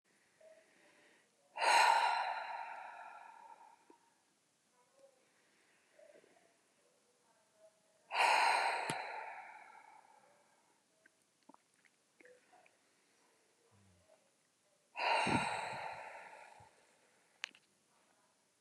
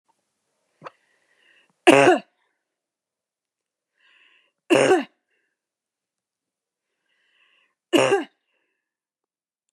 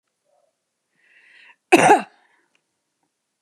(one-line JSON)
{"exhalation_length": "18.6 s", "exhalation_amplitude": 4403, "exhalation_signal_mean_std_ratio": 0.34, "three_cough_length": "9.7 s", "three_cough_amplitude": 32376, "three_cough_signal_mean_std_ratio": 0.23, "cough_length": "3.4 s", "cough_amplitude": 32615, "cough_signal_mean_std_ratio": 0.22, "survey_phase": "beta (2021-08-13 to 2022-03-07)", "age": "45-64", "gender": "Female", "wearing_mask": "No", "symptom_none": true, "smoker_status": "Ex-smoker", "respiratory_condition_asthma": false, "respiratory_condition_other": false, "recruitment_source": "REACT", "submission_delay": "1 day", "covid_test_result": "Negative", "covid_test_method": "RT-qPCR", "influenza_a_test_result": "Negative", "influenza_b_test_result": "Negative"}